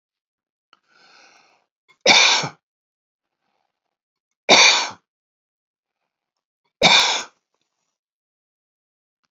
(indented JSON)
{
  "three_cough_length": "9.3 s",
  "three_cough_amplitude": 32555,
  "three_cough_signal_mean_std_ratio": 0.27,
  "survey_phase": "beta (2021-08-13 to 2022-03-07)",
  "age": "65+",
  "gender": "Male",
  "wearing_mask": "No",
  "symptom_none": true,
  "smoker_status": "Never smoked",
  "respiratory_condition_asthma": false,
  "respiratory_condition_other": false,
  "recruitment_source": "REACT",
  "submission_delay": "2 days",
  "covid_test_result": "Negative",
  "covid_test_method": "RT-qPCR",
  "influenza_a_test_result": "Unknown/Void",
  "influenza_b_test_result": "Unknown/Void"
}